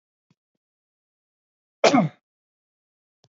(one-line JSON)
{"cough_length": "3.3 s", "cough_amplitude": 26555, "cough_signal_mean_std_ratio": 0.2, "survey_phase": "beta (2021-08-13 to 2022-03-07)", "age": "18-44", "gender": "Male", "wearing_mask": "No", "symptom_none": true, "smoker_status": "Ex-smoker", "respiratory_condition_asthma": false, "respiratory_condition_other": false, "recruitment_source": "REACT", "submission_delay": "4 days", "covid_test_result": "Negative", "covid_test_method": "RT-qPCR", "influenza_a_test_result": "Negative", "influenza_b_test_result": "Negative"}